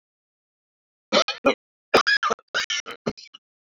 {"three_cough_length": "3.8 s", "three_cough_amplitude": 25324, "three_cough_signal_mean_std_ratio": 0.35, "survey_phase": "beta (2021-08-13 to 2022-03-07)", "age": "45-64", "gender": "Male", "wearing_mask": "No", "symptom_cough_any": true, "symptom_sore_throat": true, "symptom_fatigue": true, "symptom_headache": true, "symptom_other": true, "smoker_status": "Never smoked", "respiratory_condition_asthma": false, "respiratory_condition_other": false, "recruitment_source": "Test and Trace", "submission_delay": "2 days", "covid_test_result": "Positive", "covid_test_method": "RT-qPCR"}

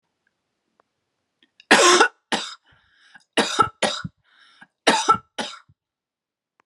{"three_cough_length": "6.7 s", "three_cough_amplitude": 32502, "three_cough_signal_mean_std_ratio": 0.32, "survey_phase": "beta (2021-08-13 to 2022-03-07)", "age": "18-44", "gender": "Female", "wearing_mask": "No", "symptom_none": true, "smoker_status": "Never smoked", "respiratory_condition_asthma": false, "respiratory_condition_other": false, "recruitment_source": "REACT", "submission_delay": "0 days", "covid_test_result": "Negative", "covid_test_method": "RT-qPCR"}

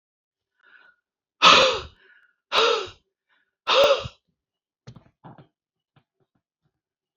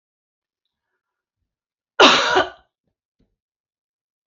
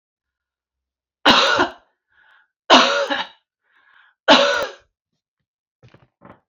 {"exhalation_length": "7.2 s", "exhalation_amplitude": 30603, "exhalation_signal_mean_std_ratio": 0.29, "cough_length": "4.3 s", "cough_amplitude": 29835, "cough_signal_mean_std_ratio": 0.24, "three_cough_length": "6.5 s", "three_cough_amplitude": 32354, "three_cough_signal_mean_std_ratio": 0.34, "survey_phase": "beta (2021-08-13 to 2022-03-07)", "age": "45-64", "gender": "Female", "wearing_mask": "No", "symptom_none": true, "symptom_onset": "5 days", "smoker_status": "Ex-smoker", "respiratory_condition_asthma": false, "respiratory_condition_other": false, "recruitment_source": "REACT", "submission_delay": "3 days", "covid_test_result": "Negative", "covid_test_method": "RT-qPCR"}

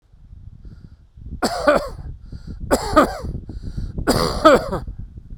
{"three_cough_length": "5.4 s", "three_cough_amplitude": 32768, "three_cough_signal_mean_std_ratio": 0.51, "survey_phase": "beta (2021-08-13 to 2022-03-07)", "age": "45-64", "gender": "Male", "wearing_mask": "No", "symptom_fatigue": true, "smoker_status": "Ex-smoker", "respiratory_condition_asthma": false, "respiratory_condition_other": false, "recruitment_source": "REACT", "submission_delay": "4 days", "covid_test_result": "Negative", "covid_test_method": "RT-qPCR"}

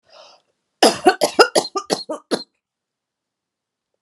{"cough_length": "4.0 s", "cough_amplitude": 32768, "cough_signal_mean_std_ratio": 0.3, "survey_phase": "alpha (2021-03-01 to 2021-08-12)", "age": "45-64", "gender": "Female", "wearing_mask": "No", "symptom_none": true, "symptom_onset": "12 days", "smoker_status": "Never smoked", "respiratory_condition_asthma": false, "respiratory_condition_other": false, "recruitment_source": "REACT", "submission_delay": "2 days", "covid_test_result": "Negative", "covid_test_method": "RT-qPCR"}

